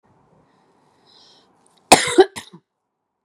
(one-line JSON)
{"cough_length": "3.2 s", "cough_amplitude": 32768, "cough_signal_mean_std_ratio": 0.21, "survey_phase": "beta (2021-08-13 to 2022-03-07)", "age": "18-44", "gender": "Female", "wearing_mask": "No", "symptom_runny_or_blocked_nose": true, "symptom_fatigue": true, "symptom_change_to_sense_of_smell_or_taste": true, "symptom_onset": "4 days", "smoker_status": "Never smoked", "respiratory_condition_asthma": false, "respiratory_condition_other": false, "recruitment_source": "Test and Trace", "submission_delay": "2 days", "covid_test_result": "Positive", "covid_test_method": "RT-qPCR"}